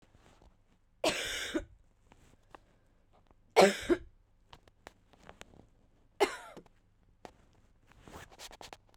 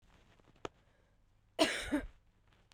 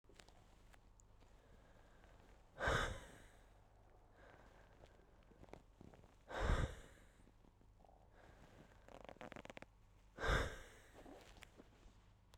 three_cough_length: 9.0 s
three_cough_amplitude: 11623
three_cough_signal_mean_std_ratio: 0.24
cough_length: 2.7 s
cough_amplitude: 6389
cough_signal_mean_std_ratio: 0.31
exhalation_length: 12.4 s
exhalation_amplitude: 2109
exhalation_signal_mean_std_ratio: 0.36
survey_phase: beta (2021-08-13 to 2022-03-07)
age: 18-44
gender: Female
wearing_mask: 'No'
symptom_cough_any: true
symptom_new_continuous_cough: true
symptom_runny_or_blocked_nose: true
symptom_shortness_of_breath: true
symptom_sore_throat: true
symptom_fatigue: true
symptom_fever_high_temperature: true
symptom_headache: true
symptom_change_to_sense_of_smell_or_taste: true
symptom_onset: 5 days
smoker_status: Never smoked
respiratory_condition_asthma: true
respiratory_condition_other: false
recruitment_source: Test and Trace
submission_delay: 2 days
covid_test_result: Positive
covid_test_method: RT-qPCR
covid_ct_value: 23.1
covid_ct_gene: N gene
covid_ct_mean: 23.3
covid_viral_load: 22000 copies/ml
covid_viral_load_category: Low viral load (10K-1M copies/ml)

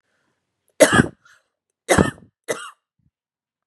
three_cough_length: 3.7 s
three_cough_amplitude: 32768
three_cough_signal_mean_std_ratio: 0.26
survey_phase: beta (2021-08-13 to 2022-03-07)
age: 45-64
gender: Female
wearing_mask: 'No'
symptom_none: true
smoker_status: Never smoked
respiratory_condition_asthma: false
respiratory_condition_other: false
recruitment_source: REACT
submission_delay: 4 days
covid_test_result: Negative
covid_test_method: RT-qPCR
influenza_a_test_result: Negative
influenza_b_test_result: Negative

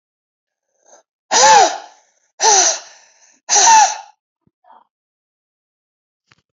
exhalation_length: 6.6 s
exhalation_amplitude: 32768
exhalation_signal_mean_std_ratio: 0.36
survey_phase: alpha (2021-03-01 to 2021-08-12)
age: 45-64
gender: Female
wearing_mask: 'No'
symptom_cough_any: true
symptom_fatigue: true
symptom_change_to_sense_of_smell_or_taste: true
symptom_loss_of_taste: true
smoker_status: Never smoked
respiratory_condition_asthma: false
respiratory_condition_other: false
recruitment_source: Test and Trace
submission_delay: 2 days
covid_test_result: Positive
covid_test_method: RT-qPCR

